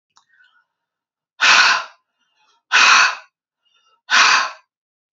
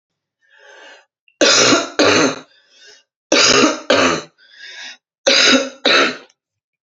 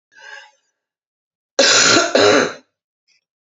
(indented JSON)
{
  "exhalation_length": "5.1 s",
  "exhalation_amplitude": 31371,
  "exhalation_signal_mean_std_ratio": 0.4,
  "three_cough_length": "6.8 s",
  "three_cough_amplitude": 32767,
  "three_cough_signal_mean_std_ratio": 0.51,
  "cough_length": "3.5 s",
  "cough_amplitude": 30929,
  "cough_signal_mean_std_ratio": 0.43,
  "survey_phase": "beta (2021-08-13 to 2022-03-07)",
  "age": "45-64",
  "gender": "Female",
  "wearing_mask": "No",
  "symptom_none": true,
  "smoker_status": "Ex-smoker",
  "respiratory_condition_asthma": false,
  "respiratory_condition_other": false,
  "recruitment_source": "Test and Trace",
  "submission_delay": "3 days",
  "covid_test_result": "Negative",
  "covid_test_method": "ePCR"
}